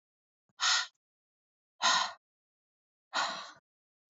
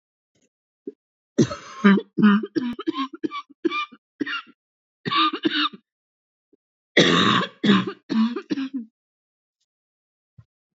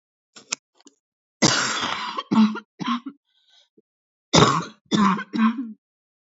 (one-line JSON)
{"exhalation_length": "4.1 s", "exhalation_amplitude": 7209, "exhalation_signal_mean_std_ratio": 0.34, "three_cough_length": "10.8 s", "three_cough_amplitude": 26597, "three_cough_signal_mean_std_ratio": 0.42, "cough_length": "6.3 s", "cough_amplitude": 27342, "cough_signal_mean_std_ratio": 0.44, "survey_phase": "beta (2021-08-13 to 2022-03-07)", "age": "18-44", "gender": "Female", "wearing_mask": "No", "symptom_cough_any": true, "symptom_new_continuous_cough": true, "symptom_fatigue": true, "symptom_fever_high_temperature": true, "symptom_headache": true, "symptom_other": true, "symptom_onset": "8 days", "smoker_status": "Never smoked", "respiratory_condition_asthma": true, "respiratory_condition_other": false, "recruitment_source": "Test and Trace", "submission_delay": "2 days", "covid_test_result": "Positive", "covid_test_method": "RT-qPCR"}